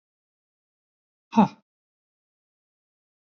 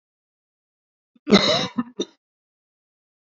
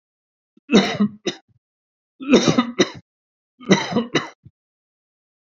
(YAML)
exhalation_length: 3.2 s
exhalation_amplitude: 14327
exhalation_signal_mean_std_ratio: 0.15
cough_length: 3.3 s
cough_amplitude: 28479
cough_signal_mean_std_ratio: 0.27
three_cough_length: 5.5 s
three_cough_amplitude: 30330
three_cough_signal_mean_std_ratio: 0.36
survey_phase: beta (2021-08-13 to 2022-03-07)
age: 45-64
gender: Male
wearing_mask: 'No'
symptom_none: true
smoker_status: Never smoked
respiratory_condition_asthma: false
respiratory_condition_other: false
recruitment_source: REACT
submission_delay: 2 days
covid_test_result: Negative
covid_test_method: RT-qPCR
influenza_a_test_result: Negative
influenza_b_test_result: Negative